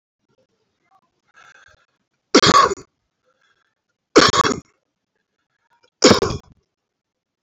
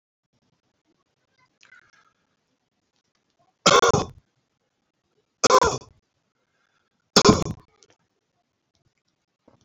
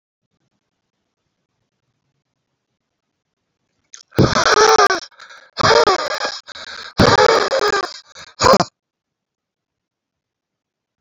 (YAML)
cough_length: 7.4 s
cough_amplitude: 32768
cough_signal_mean_std_ratio: 0.27
three_cough_length: 9.6 s
three_cough_amplitude: 28705
three_cough_signal_mean_std_ratio: 0.23
exhalation_length: 11.0 s
exhalation_amplitude: 30249
exhalation_signal_mean_std_ratio: 0.37
survey_phase: alpha (2021-03-01 to 2021-08-12)
age: 18-44
gender: Male
wearing_mask: 'No'
symptom_fatigue: true
symptom_headache: true
symptom_change_to_sense_of_smell_or_taste: true
symptom_loss_of_taste: true
symptom_onset: 3 days
smoker_status: Never smoked
respiratory_condition_asthma: false
respiratory_condition_other: false
recruitment_source: Test and Trace
submission_delay: 1 day
covid_test_result: Positive
covid_test_method: RT-qPCR
covid_ct_value: 25.0
covid_ct_gene: ORF1ab gene
covid_ct_mean: 25.6
covid_viral_load: 4200 copies/ml
covid_viral_load_category: Minimal viral load (< 10K copies/ml)